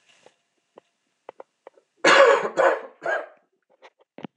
{"cough_length": "4.4 s", "cough_amplitude": 23823, "cough_signal_mean_std_ratio": 0.34, "survey_phase": "beta (2021-08-13 to 2022-03-07)", "age": "45-64", "gender": "Male", "wearing_mask": "No", "symptom_cough_any": true, "symptom_runny_or_blocked_nose": true, "symptom_sore_throat": true, "symptom_headache": true, "symptom_change_to_sense_of_smell_or_taste": true, "symptom_other": true, "symptom_onset": "3 days", "smoker_status": "Never smoked", "respiratory_condition_asthma": false, "respiratory_condition_other": false, "recruitment_source": "Test and Trace", "submission_delay": "2 days", "covid_test_result": "Positive", "covid_test_method": "RT-qPCR", "covid_ct_value": 23.3, "covid_ct_gene": "ORF1ab gene", "covid_ct_mean": 23.7, "covid_viral_load": "17000 copies/ml", "covid_viral_load_category": "Low viral load (10K-1M copies/ml)"}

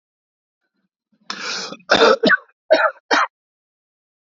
{"cough_length": "4.4 s", "cough_amplitude": 29796, "cough_signal_mean_std_ratio": 0.37, "survey_phase": "beta (2021-08-13 to 2022-03-07)", "age": "18-44", "gender": "Male", "wearing_mask": "No", "symptom_sore_throat": true, "symptom_onset": "4 days", "smoker_status": "Never smoked", "respiratory_condition_asthma": false, "respiratory_condition_other": false, "recruitment_source": "REACT", "submission_delay": "1 day", "covid_test_result": "Negative", "covid_test_method": "RT-qPCR"}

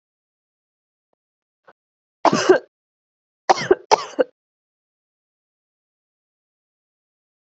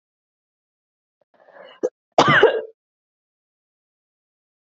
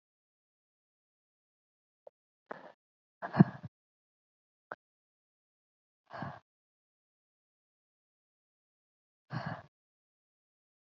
{"three_cough_length": "7.6 s", "three_cough_amplitude": 29938, "three_cough_signal_mean_std_ratio": 0.2, "cough_length": "4.8 s", "cough_amplitude": 32767, "cough_signal_mean_std_ratio": 0.24, "exhalation_length": "10.9 s", "exhalation_amplitude": 13228, "exhalation_signal_mean_std_ratio": 0.11, "survey_phase": "beta (2021-08-13 to 2022-03-07)", "age": "18-44", "gender": "Female", "wearing_mask": "Yes", "symptom_runny_or_blocked_nose": true, "symptom_sore_throat": true, "symptom_headache": true, "symptom_onset": "4 days", "smoker_status": "Never smoked", "respiratory_condition_asthma": false, "respiratory_condition_other": false, "recruitment_source": "Test and Trace", "submission_delay": "2 days", "covid_test_result": "Positive", "covid_test_method": "RT-qPCR", "covid_ct_value": 18.2, "covid_ct_gene": "ORF1ab gene", "covid_ct_mean": 18.5, "covid_viral_load": "840000 copies/ml", "covid_viral_load_category": "Low viral load (10K-1M copies/ml)"}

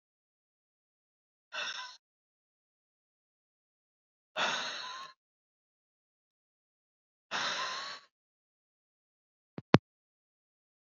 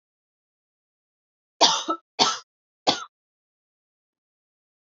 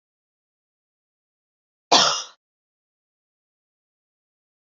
{"exhalation_length": "10.8 s", "exhalation_amplitude": 26520, "exhalation_signal_mean_std_ratio": 0.21, "three_cough_length": "4.9 s", "three_cough_amplitude": 26496, "three_cough_signal_mean_std_ratio": 0.24, "cough_length": "4.6 s", "cough_amplitude": 28510, "cough_signal_mean_std_ratio": 0.18, "survey_phase": "beta (2021-08-13 to 2022-03-07)", "age": "18-44", "gender": "Female", "wearing_mask": "No", "symptom_fatigue": true, "symptom_onset": "3 days", "smoker_status": "Never smoked", "respiratory_condition_asthma": false, "respiratory_condition_other": false, "recruitment_source": "Test and Trace", "submission_delay": "2 days", "covid_test_result": "Positive", "covid_test_method": "RT-qPCR", "covid_ct_value": 31.4, "covid_ct_gene": "ORF1ab gene", "covid_ct_mean": 32.1, "covid_viral_load": "30 copies/ml", "covid_viral_load_category": "Minimal viral load (< 10K copies/ml)"}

